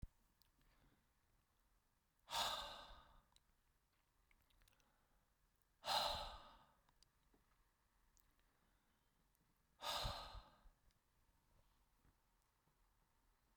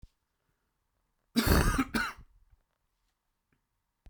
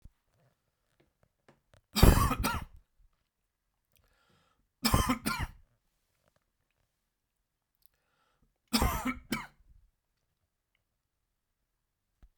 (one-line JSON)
{"exhalation_length": "13.6 s", "exhalation_amplitude": 1186, "exhalation_signal_mean_std_ratio": 0.3, "cough_length": "4.1 s", "cough_amplitude": 10612, "cough_signal_mean_std_ratio": 0.32, "three_cough_length": "12.4 s", "three_cough_amplitude": 19372, "three_cough_signal_mean_std_ratio": 0.24, "survey_phase": "beta (2021-08-13 to 2022-03-07)", "age": "65+", "gender": "Male", "wearing_mask": "No", "symptom_none": true, "smoker_status": "Never smoked", "respiratory_condition_asthma": false, "respiratory_condition_other": false, "recruitment_source": "REACT", "submission_delay": "2 days", "covid_test_result": "Negative", "covid_test_method": "RT-qPCR", "influenza_a_test_result": "Negative", "influenza_b_test_result": "Negative"}